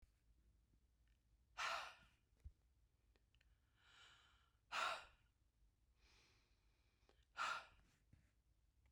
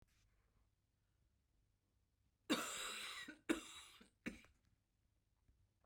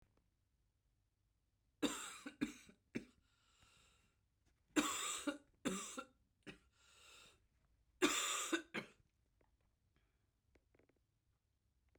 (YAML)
exhalation_length: 8.9 s
exhalation_amplitude: 750
exhalation_signal_mean_std_ratio: 0.32
cough_length: 5.9 s
cough_amplitude: 1680
cough_signal_mean_std_ratio: 0.32
three_cough_length: 12.0 s
three_cough_amplitude: 2846
three_cough_signal_mean_std_ratio: 0.32
survey_phase: beta (2021-08-13 to 2022-03-07)
age: 45-64
gender: Female
wearing_mask: 'No'
symptom_cough_any: true
symptom_fatigue: true
symptom_headache: true
smoker_status: Ex-smoker
respiratory_condition_asthma: false
respiratory_condition_other: false
recruitment_source: Test and Trace
submission_delay: 1 day
covid_test_result: Negative
covid_test_method: ePCR